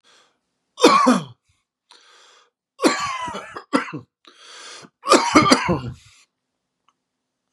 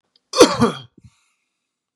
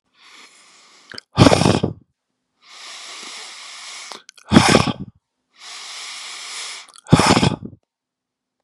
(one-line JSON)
{"three_cough_length": "7.5 s", "three_cough_amplitude": 32767, "three_cough_signal_mean_std_ratio": 0.37, "cough_length": "2.0 s", "cough_amplitude": 32768, "cough_signal_mean_std_ratio": 0.29, "exhalation_length": "8.6 s", "exhalation_amplitude": 32768, "exhalation_signal_mean_std_ratio": 0.34, "survey_phase": "beta (2021-08-13 to 2022-03-07)", "age": "45-64", "gender": "Male", "wearing_mask": "No", "symptom_none": true, "smoker_status": "Never smoked", "respiratory_condition_asthma": false, "respiratory_condition_other": false, "recruitment_source": "REACT", "submission_delay": "1 day", "covid_test_result": "Negative", "covid_test_method": "RT-qPCR", "influenza_a_test_result": "Negative", "influenza_b_test_result": "Negative"}